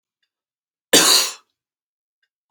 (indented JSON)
{
  "cough_length": "2.5 s",
  "cough_amplitude": 32768,
  "cough_signal_mean_std_ratio": 0.3,
  "survey_phase": "beta (2021-08-13 to 2022-03-07)",
  "age": "18-44",
  "gender": "Male",
  "wearing_mask": "No",
  "symptom_none": true,
  "smoker_status": "Ex-smoker",
  "respiratory_condition_asthma": true,
  "respiratory_condition_other": false,
  "recruitment_source": "REACT",
  "submission_delay": "1 day",
  "covid_test_result": "Negative",
  "covid_test_method": "RT-qPCR",
  "influenza_a_test_result": "Negative",
  "influenza_b_test_result": "Negative"
}